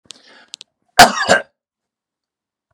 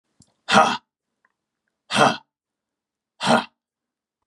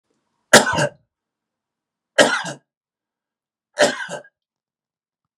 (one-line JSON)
{"cough_length": "2.7 s", "cough_amplitude": 32768, "cough_signal_mean_std_ratio": 0.25, "exhalation_length": "4.3 s", "exhalation_amplitude": 32767, "exhalation_signal_mean_std_ratio": 0.3, "three_cough_length": "5.4 s", "three_cough_amplitude": 32768, "three_cough_signal_mean_std_ratio": 0.27, "survey_phase": "beta (2021-08-13 to 2022-03-07)", "age": "45-64", "gender": "Male", "wearing_mask": "No", "symptom_none": true, "smoker_status": "Ex-smoker", "respiratory_condition_asthma": false, "respiratory_condition_other": false, "recruitment_source": "REACT", "submission_delay": "2 days", "covid_test_result": "Negative", "covid_test_method": "RT-qPCR", "influenza_a_test_result": "Negative", "influenza_b_test_result": "Negative"}